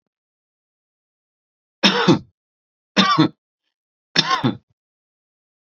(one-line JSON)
{"three_cough_length": "5.6 s", "three_cough_amplitude": 32768, "three_cough_signal_mean_std_ratio": 0.31, "survey_phase": "beta (2021-08-13 to 2022-03-07)", "age": "18-44", "gender": "Male", "wearing_mask": "No", "symptom_runny_or_blocked_nose": true, "smoker_status": "Never smoked", "respiratory_condition_asthma": false, "respiratory_condition_other": false, "recruitment_source": "Test and Trace", "submission_delay": "2 days", "covid_test_result": "Positive", "covid_test_method": "RT-qPCR", "covid_ct_value": 23.5, "covid_ct_gene": "ORF1ab gene"}